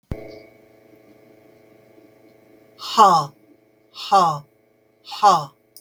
{"exhalation_length": "5.8 s", "exhalation_amplitude": 32768, "exhalation_signal_mean_std_ratio": 0.32, "survey_phase": "beta (2021-08-13 to 2022-03-07)", "age": "45-64", "gender": "Female", "wearing_mask": "No", "symptom_none": true, "smoker_status": "Never smoked", "respiratory_condition_asthma": false, "respiratory_condition_other": false, "recruitment_source": "REACT", "submission_delay": "3 days", "covid_test_result": "Negative", "covid_test_method": "RT-qPCR"}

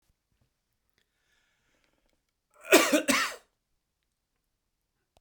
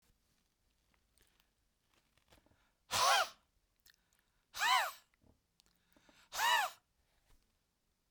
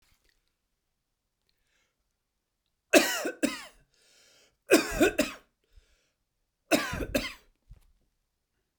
{"cough_length": "5.2 s", "cough_amplitude": 19612, "cough_signal_mean_std_ratio": 0.23, "exhalation_length": "8.1 s", "exhalation_amplitude": 4062, "exhalation_signal_mean_std_ratio": 0.29, "three_cough_length": "8.8 s", "three_cough_amplitude": 17398, "three_cough_signal_mean_std_ratio": 0.27, "survey_phase": "beta (2021-08-13 to 2022-03-07)", "age": "45-64", "gender": "Male", "wearing_mask": "No", "symptom_shortness_of_breath": true, "symptom_diarrhoea": true, "smoker_status": "Ex-smoker", "respiratory_condition_asthma": false, "respiratory_condition_other": false, "recruitment_source": "REACT", "submission_delay": "1 day", "covid_test_result": "Negative", "covid_test_method": "RT-qPCR"}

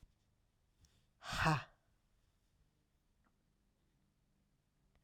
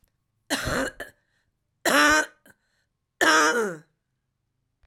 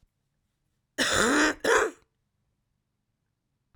{"exhalation_length": "5.0 s", "exhalation_amplitude": 2883, "exhalation_signal_mean_std_ratio": 0.22, "three_cough_length": "4.9 s", "three_cough_amplitude": 16826, "three_cough_signal_mean_std_ratio": 0.4, "cough_length": "3.8 s", "cough_amplitude": 13117, "cough_signal_mean_std_ratio": 0.38, "survey_phase": "beta (2021-08-13 to 2022-03-07)", "age": "65+", "gender": "Female", "wearing_mask": "No", "symptom_cough_any": true, "symptom_runny_or_blocked_nose": true, "symptom_fatigue": true, "symptom_headache": true, "symptom_change_to_sense_of_smell_or_taste": true, "symptom_loss_of_taste": true, "symptom_onset": "6 days", "smoker_status": "Ex-smoker", "respiratory_condition_asthma": false, "respiratory_condition_other": false, "recruitment_source": "Test and Trace", "submission_delay": "2 days", "covid_test_result": "Positive", "covid_test_method": "RT-qPCR"}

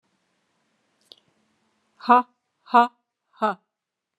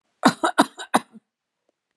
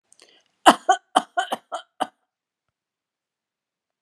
{"exhalation_length": "4.2 s", "exhalation_amplitude": 22851, "exhalation_signal_mean_std_ratio": 0.21, "cough_length": "2.0 s", "cough_amplitude": 31846, "cough_signal_mean_std_ratio": 0.28, "three_cough_length": "4.0 s", "three_cough_amplitude": 32768, "three_cough_signal_mean_std_ratio": 0.21, "survey_phase": "beta (2021-08-13 to 2022-03-07)", "age": "45-64", "gender": "Female", "wearing_mask": "No", "symptom_none": true, "smoker_status": "Never smoked", "respiratory_condition_asthma": false, "respiratory_condition_other": true, "recruitment_source": "REACT", "submission_delay": "3 days", "covid_test_result": "Negative", "covid_test_method": "RT-qPCR"}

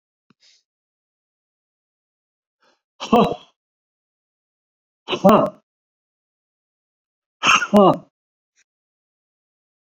{"exhalation_length": "9.9 s", "exhalation_amplitude": 29391, "exhalation_signal_mean_std_ratio": 0.24, "survey_phase": "beta (2021-08-13 to 2022-03-07)", "age": "65+", "gender": "Male", "wearing_mask": "No", "symptom_none": true, "smoker_status": "Ex-smoker", "respiratory_condition_asthma": false, "respiratory_condition_other": false, "recruitment_source": "REACT", "submission_delay": "2 days", "covid_test_result": "Negative", "covid_test_method": "RT-qPCR"}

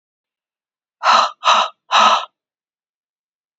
{"exhalation_length": "3.6 s", "exhalation_amplitude": 30519, "exhalation_signal_mean_std_ratio": 0.38, "survey_phase": "beta (2021-08-13 to 2022-03-07)", "age": "18-44", "gender": "Female", "wearing_mask": "No", "symptom_cough_any": true, "symptom_runny_or_blocked_nose": true, "symptom_fever_high_temperature": true, "symptom_headache": true, "smoker_status": "Ex-smoker", "respiratory_condition_asthma": false, "respiratory_condition_other": false, "recruitment_source": "Test and Trace", "submission_delay": "2 days", "covid_test_result": "Positive", "covid_test_method": "RT-qPCR", "covid_ct_value": 19.7, "covid_ct_gene": "ORF1ab gene"}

